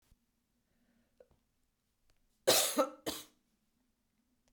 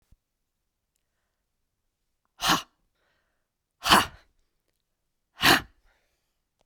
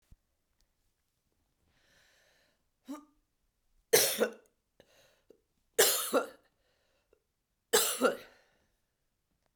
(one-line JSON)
{"cough_length": "4.5 s", "cough_amplitude": 7342, "cough_signal_mean_std_ratio": 0.25, "exhalation_length": "6.7 s", "exhalation_amplitude": 20192, "exhalation_signal_mean_std_ratio": 0.22, "three_cough_length": "9.6 s", "three_cough_amplitude": 14167, "three_cough_signal_mean_std_ratio": 0.27, "survey_phase": "beta (2021-08-13 to 2022-03-07)", "age": "65+", "gender": "Female", "wearing_mask": "No", "symptom_cough_any": true, "symptom_fatigue": true, "symptom_headache": true, "symptom_onset": "9 days", "smoker_status": "Ex-smoker", "respiratory_condition_asthma": false, "respiratory_condition_other": false, "recruitment_source": "Test and Trace", "submission_delay": "3 days", "covid_test_result": "Positive", "covid_test_method": "RT-qPCR", "covid_ct_value": 13.3, "covid_ct_gene": "ORF1ab gene", "covid_ct_mean": 13.8, "covid_viral_load": "30000000 copies/ml", "covid_viral_load_category": "High viral load (>1M copies/ml)"}